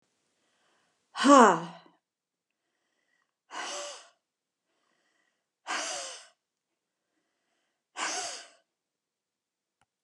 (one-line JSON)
{"exhalation_length": "10.0 s", "exhalation_amplitude": 20269, "exhalation_signal_mean_std_ratio": 0.21, "survey_phase": "beta (2021-08-13 to 2022-03-07)", "age": "65+", "gender": "Female", "wearing_mask": "No", "symptom_none": true, "smoker_status": "Ex-smoker", "respiratory_condition_asthma": false, "respiratory_condition_other": false, "recruitment_source": "REACT", "submission_delay": "3 days", "covid_test_result": "Negative", "covid_test_method": "RT-qPCR", "influenza_a_test_result": "Negative", "influenza_b_test_result": "Negative"}